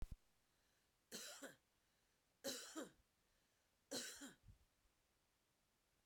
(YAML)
three_cough_length: 6.1 s
three_cough_amplitude: 728
three_cough_signal_mean_std_ratio: 0.38
survey_phase: beta (2021-08-13 to 2022-03-07)
age: 45-64
gender: Female
wearing_mask: 'No'
symptom_cough_any: true
symptom_runny_or_blocked_nose: true
symptom_sore_throat: true
symptom_diarrhoea: true
symptom_fatigue: true
smoker_status: Ex-smoker
respiratory_condition_asthma: false
respiratory_condition_other: false
recruitment_source: Test and Trace
submission_delay: 1 day
covid_test_result: Positive
covid_test_method: RT-qPCR
covid_ct_value: 19.1
covid_ct_gene: ORF1ab gene